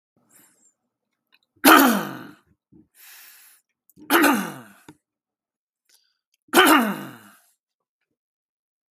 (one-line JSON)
{"three_cough_length": "8.9 s", "three_cough_amplitude": 32768, "three_cough_signal_mean_std_ratio": 0.29, "survey_phase": "beta (2021-08-13 to 2022-03-07)", "age": "18-44", "gender": "Male", "wearing_mask": "No", "symptom_none": true, "smoker_status": "Never smoked", "respiratory_condition_asthma": false, "respiratory_condition_other": false, "recruitment_source": "REACT", "submission_delay": "1 day", "covid_test_result": "Negative", "covid_test_method": "RT-qPCR"}